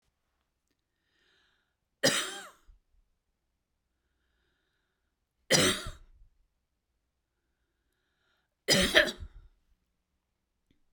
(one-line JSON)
{"three_cough_length": "10.9 s", "three_cough_amplitude": 17794, "three_cough_signal_mean_std_ratio": 0.24, "survey_phase": "beta (2021-08-13 to 2022-03-07)", "age": "45-64", "gender": "Female", "wearing_mask": "No", "symptom_none": true, "smoker_status": "Never smoked", "respiratory_condition_asthma": false, "respiratory_condition_other": false, "recruitment_source": "REACT", "submission_delay": "1 day", "covid_test_result": "Negative", "covid_test_method": "RT-qPCR", "influenza_a_test_result": "Negative", "influenza_b_test_result": "Negative"}